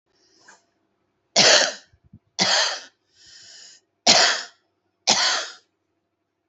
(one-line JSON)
{"cough_length": "6.5 s", "cough_amplitude": 31164, "cough_signal_mean_std_ratio": 0.37, "survey_phase": "beta (2021-08-13 to 2022-03-07)", "age": "45-64", "gender": "Female", "wearing_mask": "No", "symptom_cough_any": true, "symptom_onset": "5 days", "smoker_status": "Current smoker (1 to 10 cigarettes per day)", "respiratory_condition_asthma": false, "respiratory_condition_other": false, "recruitment_source": "REACT", "submission_delay": "3 days", "covid_test_result": "Negative", "covid_test_method": "RT-qPCR"}